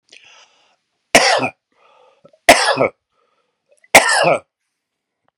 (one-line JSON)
{"three_cough_length": "5.4 s", "three_cough_amplitude": 32768, "three_cough_signal_mean_std_ratio": 0.34, "survey_phase": "beta (2021-08-13 to 2022-03-07)", "age": "45-64", "gender": "Male", "wearing_mask": "No", "symptom_diarrhoea": true, "symptom_onset": "12 days", "smoker_status": "Prefer not to say", "respiratory_condition_asthma": false, "respiratory_condition_other": false, "recruitment_source": "REACT", "submission_delay": "1 day", "covid_test_result": "Negative", "covid_test_method": "RT-qPCR"}